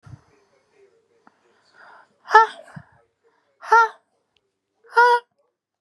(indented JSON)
{
  "exhalation_length": "5.8 s",
  "exhalation_amplitude": 32705,
  "exhalation_signal_mean_std_ratio": 0.25,
  "survey_phase": "beta (2021-08-13 to 2022-03-07)",
  "age": "18-44",
  "gender": "Female",
  "wearing_mask": "No",
  "symptom_none": true,
  "smoker_status": "Ex-smoker",
  "respiratory_condition_asthma": false,
  "respiratory_condition_other": false,
  "recruitment_source": "REACT",
  "submission_delay": "8 days",
  "covid_test_result": "Negative",
  "covid_test_method": "RT-qPCR",
  "influenza_a_test_result": "Negative",
  "influenza_b_test_result": "Negative"
}